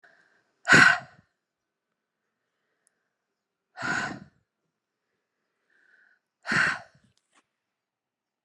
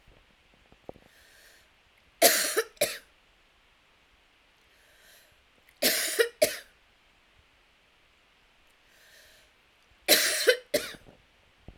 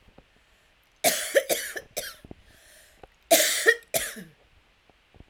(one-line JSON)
{"exhalation_length": "8.4 s", "exhalation_amplitude": 20244, "exhalation_signal_mean_std_ratio": 0.22, "three_cough_length": "11.8 s", "three_cough_amplitude": 21871, "three_cough_signal_mean_std_ratio": 0.29, "cough_length": "5.3 s", "cough_amplitude": 20336, "cough_signal_mean_std_ratio": 0.36, "survey_phase": "alpha (2021-03-01 to 2021-08-12)", "age": "45-64", "gender": "Female", "wearing_mask": "No", "symptom_cough_any": true, "symptom_shortness_of_breath": true, "symptom_fatigue": true, "symptom_headache": true, "symptom_change_to_sense_of_smell_or_taste": true, "symptom_onset": "4 days", "smoker_status": "Current smoker (1 to 10 cigarettes per day)", "respiratory_condition_asthma": true, "respiratory_condition_other": false, "recruitment_source": "Test and Trace", "submission_delay": "1 day", "covid_test_result": "Positive", "covid_test_method": "RT-qPCR", "covid_ct_value": 20.2, "covid_ct_gene": "ORF1ab gene"}